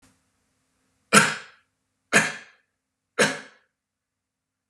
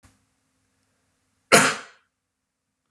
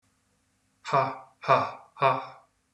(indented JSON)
{
  "three_cough_length": "4.7 s",
  "three_cough_amplitude": 31868,
  "three_cough_signal_mean_std_ratio": 0.25,
  "cough_length": "2.9 s",
  "cough_amplitude": 31441,
  "cough_signal_mean_std_ratio": 0.21,
  "exhalation_length": "2.7 s",
  "exhalation_amplitude": 14872,
  "exhalation_signal_mean_std_ratio": 0.39,
  "survey_phase": "beta (2021-08-13 to 2022-03-07)",
  "age": "18-44",
  "gender": "Male",
  "wearing_mask": "No",
  "symptom_none": true,
  "smoker_status": "Never smoked",
  "respiratory_condition_asthma": false,
  "respiratory_condition_other": false,
  "recruitment_source": "REACT",
  "submission_delay": "1 day",
  "covid_test_result": "Negative",
  "covid_test_method": "RT-qPCR"
}